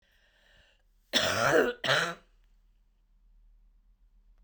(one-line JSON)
{"cough_length": "4.4 s", "cough_amplitude": 10334, "cough_signal_mean_std_ratio": 0.37, "survey_phase": "beta (2021-08-13 to 2022-03-07)", "age": "45-64", "gender": "Female", "wearing_mask": "No", "symptom_new_continuous_cough": true, "symptom_runny_or_blocked_nose": true, "symptom_sore_throat": true, "symptom_fatigue": true, "symptom_fever_high_temperature": true, "symptom_headache": true, "symptom_onset": "1 day", "smoker_status": "Never smoked", "respiratory_condition_asthma": false, "respiratory_condition_other": false, "recruitment_source": "Test and Trace", "submission_delay": "1 day", "covid_test_result": "Negative", "covid_test_method": "RT-qPCR"}